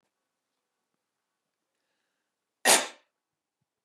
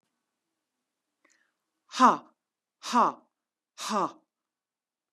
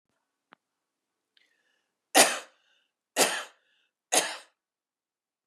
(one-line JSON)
{"cough_length": "3.8 s", "cough_amplitude": 15834, "cough_signal_mean_std_ratio": 0.17, "exhalation_length": "5.1 s", "exhalation_amplitude": 15953, "exhalation_signal_mean_std_ratio": 0.25, "three_cough_length": "5.5 s", "three_cough_amplitude": 18629, "three_cough_signal_mean_std_ratio": 0.24, "survey_phase": "beta (2021-08-13 to 2022-03-07)", "age": "45-64", "gender": "Female", "wearing_mask": "No", "symptom_none": true, "symptom_onset": "13 days", "smoker_status": "Current smoker (11 or more cigarettes per day)", "respiratory_condition_asthma": false, "respiratory_condition_other": false, "recruitment_source": "REACT", "submission_delay": "1 day", "covid_test_result": "Negative", "covid_test_method": "RT-qPCR", "influenza_a_test_result": "Negative", "influenza_b_test_result": "Negative"}